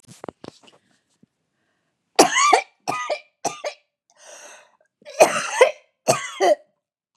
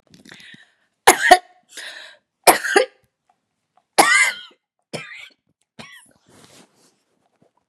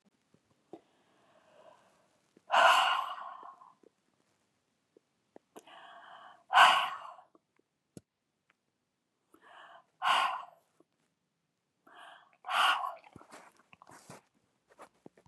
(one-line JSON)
{"cough_length": "7.2 s", "cough_amplitude": 32767, "cough_signal_mean_std_ratio": 0.34, "three_cough_length": "7.7 s", "three_cough_amplitude": 32768, "three_cough_signal_mean_std_ratio": 0.27, "exhalation_length": "15.3 s", "exhalation_amplitude": 13165, "exhalation_signal_mean_std_ratio": 0.27, "survey_phase": "beta (2021-08-13 to 2022-03-07)", "age": "45-64", "gender": "Female", "wearing_mask": "No", "symptom_runny_or_blocked_nose": true, "symptom_shortness_of_breath": true, "symptom_fatigue": true, "symptom_onset": "12 days", "smoker_status": "Never smoked", "respiratory_condition_asthma": false, "respiratory_condition_other": false, "recruitment_source": "REACT", "submission_delay": "2 days", "covid_test_result": "Negative", "covid_test_method": "RT-qPCR", "influenza_a_test_result": "Negative", "influenza_b_test_result": "Negative"}